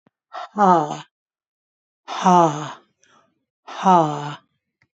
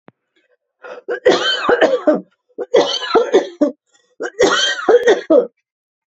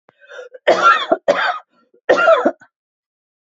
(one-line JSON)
{"exhalation_length": "4.9 s", "exhalation_amplitude": 27993, "exhalation_signal_mean_std_ratio": 0.37, "three_cough_length": "6.1 s", "three_cough_amplitude": 31671, "three_cough_signal_mean_std_ratio": 0.54, "cough_length": "3.6 s", "cough_amplitude": 28193, "cough_signal_mean_std_ratio": 0.46, "survey_phase": "beta (2021-08-13 to 2022-03-07)", "age": "65+", "gender": "Female", "wearing_mask": "No", "symptom_cough_any": true, "symptom_runny_or_blocked_nose": true, "symptom_onset": "13 days", "smoker_status": "Ex-smoker", "respiratory_condition_asthma": false, "respiratory_condition_other": false, "recruitment_source": "REACT", "submission_delay": "1 day", "covid_test_result": "Negative", "covid_test_method": "RT-qPCR", "influenza_a_test_result": "Negative", "influenza_b_test_result": "Negative"}